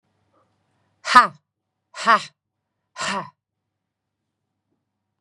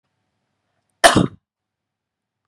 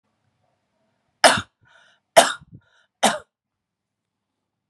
{
  "exhalation_length": "5.2 s",
  "exhalation_amplitude": 32768,
  "exhalation_signal_mean_std_ratio": 0.21,
  "cough_length": "2.5 s",
  "cough_amplitude": 32768,
  "cough_signal_mean_std_ratio": 0.21,
  "three_cough_length": "4.7 s",
  "three_cough_amplitude": 32767,
  "three_cough_signal_mean_std_ratio": 0.21,
  "survey_phase": "beta (2021-08-13 to 2022-03-07)",
  "age": "45-64",
  "gender": "Female",
  "wearing_mask": "No",
  "symptom_sore_throat": true,
  "symptom_abdominal_pain": true,
  "symptom_onset": "12 days",
  "smoker_status": "Never smoked",
  "respiratory_condition_asthma": false,
  "respiratory_condition_other": false,
  "recruitment_source": "REACT",
  "submission_delay": "2 days",
  "covid_test_result": "Negative",
  "covid_test_method": "RT-qPCR",
  "influenza_a_test_result": "Negative",
  "influenza_b_test_result": "Negative"
}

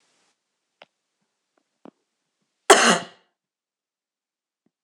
{
  "cough_length": "4.8 s",
  "cough_amplitude": 26028,
  "cough_signal_mean_std_ratio": 0.18,
  "survey_phase": "beta (2021-08-13 to 2022-03-07)",
  "age": "45-64",
  "gender": "Female",
  "wearing_mask": "No",
  "symptom_cough_any": true,
  "symptom_new_continuous_cough": true,
  "symptom_runny_or_blocked_nose": true,
  "symptom_sore_throat": true,
  "symptom_onset": "3 days",
  "smoker_status": "Never smoked",
  "respiratory_condition_asthma": false,
  "respiratory_condition_other": false,
  "recruitment_source": "Test and Trace",
  "submission_delay": "2 days",
  "covid_test_result": "Positive",
  "covid_test_method": "RT-qPCR",
  "covid_ct_value": 34.0,
  "covid_ct_gene": "ORF1ab gene"
}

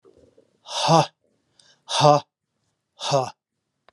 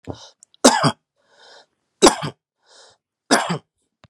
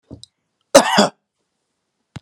{
  "exhalation_length": "3.9 s",
  "exhalation_amplitude": 26408,
  "exhalation_signal_mean_std_ratio": 0.33,
  "three_cough_length": "4.1 s",
  "three_cough_amplitude": 32767,
  "three_cough_signal_mean_std_ratio": 0.29,
  "cough_length": "2.2 s",
  "cough_amplitude": 32768,
  "cough_signal_mean_std_ratio": 0.27,
  "survey_phase": "beta (2021-08-13 to 2022-03-07)",
  "age": "65+",
  "gender": "Male",
  "wearing_mask": "No",
  "symptom_none": true,
  "smoker_status": "Never smoked",
  "respiratory_condition_asthma": false,
  "respiratory_condition_other": false,
  "recruitment_source": "REACT",
  "submission_delay": "1 day",
  "covid_test_result": "Negative",
  "covid_test_method": "RT-qPCR"
}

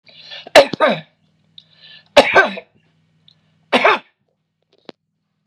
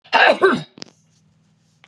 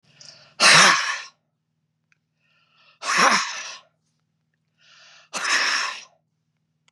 {
  "three_cough_length": "5.5 s",
  "three_cough_amplitude": 32768,
  "three_cough_signal_mean_std_ratio": 0.3,
  "cough_length": "1.9 s",
  "cough_amplitude": 31590,
  "cough_signal_mean_std_ratio": 0.39,
  "exhalation_length": "6.9 s",
  "exhalation_amplitude": 28559,
  "exhalation_signal_mean_std_ratio": 0.37,
  "survey_phase": "beta (2021-08-13 to 2022-03-07)",
  "age": "65+",
  "gender": "Female",
  "wearing_mask": "No",
  "symptom_sore_throat": true,
  "symptom_onset": "5 days",
  "smoker_status": "Never smoked",
  "respiratory_condition_asthma": false,
  "respiratory_condition_other": false,
  "recruitment_source": "REACT",
  "submission_delay": "2 days",
  "covid_test_result": "Negative",
  "covid_test_method": "RT-qPCR",
  "influenza_a_test_result": "Negative",
  "influenza_b_test_result": "Negative"
}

